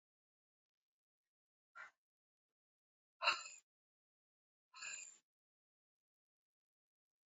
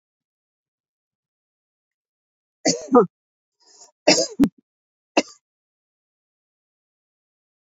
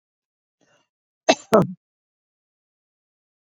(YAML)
exhalation_length: 7.3 s
exhalation_amplitude: 3643
exhalation_signal_mean_std_ratio: 0.17
three_cough_length: 7.8 s
three_cough_amplitude: 27626
three_cough_signal_mean_std_ratio: 0.21
cough_length: 3.6 s
cough_amplitude: 26789
cough_signal_mean_std_ratio: 0.18
survey_phase: beta (2021-08-13 to 2022-03-07)
age: 65+
gender: Female
wearing_mask: 'No'
symptom_none: true
smoker_status: Ex-smoker
respiratory_condition_asthma: false
respiratory_condition_other: false
recruitment_source: REACT
submission_delay: 2 days
covid_test_result: Negative
covid_test_method: RT-qPCR